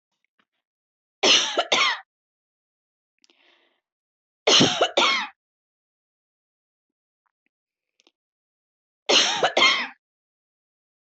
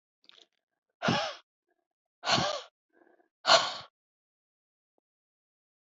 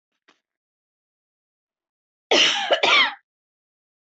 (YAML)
three_cough_length: 11.0 s
three_cough_amplitude: 19283
three_cough_signal_mean_std_ratio: 0.33
exhalation_length: 5.8 s
exhalation_amplitude: 15305
exhalation_signal_mean_std_ratio: 0.28
cough_length: 4.2 s
cough_amplitude: 20187
cough_signal_mean_std_ratio: 0.33
survey_phase: alpha (2021-03-01 to 2021-08-12)
age: 45-64
gender: Female
wearing_mask: 'No'
symptom_cough_any: true
symptom_shortness_of_breath: true
symptom_fatigue: true
symptom_headache: true
smoker_status: Ex-smoker
respiratory_condition_asthma: false
respiratory_condition_other: false
recruitment_source: REACT
submission_delay: 2 days
covid_test_result: Negative
covid_test_method: RT-qPCR